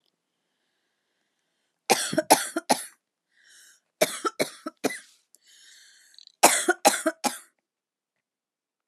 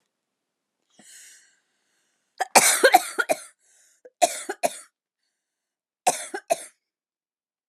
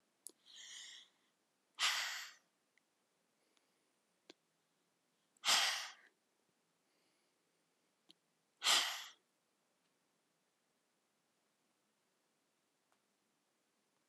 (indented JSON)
{
  "three_cough_length": "8.9 s",
  "three_cough_amplitude": 30361,
  "three_cough_signal_mean_std_ratio": 0.28,
  "cough_length": "7.7 s",
  "cough_amplitude": 32714,
  "cough_signal_mean_std_ratio": 0.26,
  "exhalation_length": "14.1 s",
  "exhalation_amplitude": 3616,
  "exhalation_signal_mean_std_ratio": 0.24,
  "survey_phase": "alpha (2021-03-01 to 2021-08-12)",
  "age": "45-64",
  "gender": "Female",
  "wearing_mask": "No",
  "symptom_none": true,
  "smoker_status": "Ex-smoker",
  "respiratory_condition_asthma": false,
  "respiratory_condition_other": false,
  "recruitment_source": "REACT",
  "submission_delay": "1 day",
  "covid_test_result": "Negative",
  "covid_test_method": "RT-qPCR"
}